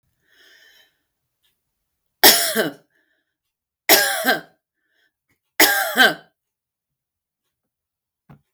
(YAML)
three_cough_length: 8.5 s
three_cough_amplitude: 32768
three_cough_signal_mean_std_ratio: 0.29
survey_phase: beta (2021-08-13 to 2022-03-07)
age: 65+
gender: Female
wearing_mask: 'No'
symptom_none: true
smoker_status: Never smoked
respiratory_condition_asthma: false
respiratory_condition_other: false
recruitment_source: REACT
submission_delay: 4 days
covid_test_result: Negative
covid_test_method: RT-qPCR
influenza_a_test_result: Negative
influenza_b_test_result: Negative